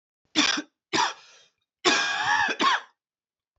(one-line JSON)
{"three_cough_length": "3.6 s", "three_cough_amplitude": 18456, "three_cough_signal_mean_std_ratio": 0.52, "survey_phase": "beta (2021-08-13 to 2022-03-07)", "age": "18-44", "gender": "Male", "wearing_mask": "No", "symptom_cough_any": true, "symptom_new_continuous_cough": true, "symptom_sore_throat": true, "symptom_fatigue": true, "symptom_onset": "6 days", "smoker_status": "Never smoked", "respiratory_condition_asthma": true, "respiratory_condition_other": false, "recruitment_source": "Test and Trace", "submission_delay": "1 day", "covid_test_result": "Positive", "covid_test_method": "RT-qPCR", "covid_ct_value": 23.9, "covid_ct_gene": "ORF1ab gene"}